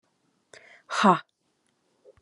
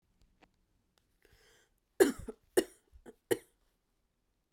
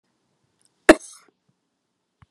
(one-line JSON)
{"exhalation_length": "2.2 s", "exhalation_amplitude": 22328, "exhalation_signal_mean_std_ratio": 0.25, "three_cough_length": "4.5 s", "three_cough_amplitude": 9117, "three_cough_signal_mean_std_ratio": 0.18, "cough_length": "2.3 s", "cough_amplitude": 32768, "cough_signal_mean_std_ratio": 0.12, "survey_phase": "beta (2021-08-13 to 2022-03-07)", "age": "18-44", "gender": "Female", "wearing_mask": "No", "symptom_cough_any": true, "symptom_runny_or_blocked_nose": true, "symptom_change_to_sense_of_smell_or_taste": true, "symptom_other": true, "symptom_onset": "6 days", "smoker_status": "Prefer not to say", "respiratory_condition_asthma": false, "respiratory_condition_other": false, "recruitment_source": "Test and Trace", "submission_delay": "2 days", "covid_test_result": "Positive", "covid_test_method": "RT-qPCR", "covid_ct_value": 18.4, "covid_ct_gene": "ORF1ab gene", "covid_ct_mean": 18.9, "covid_viral_load": "620000 copies/ml", "covid_viral_load_category": "Low viral load (10K-1M copies/ml)"}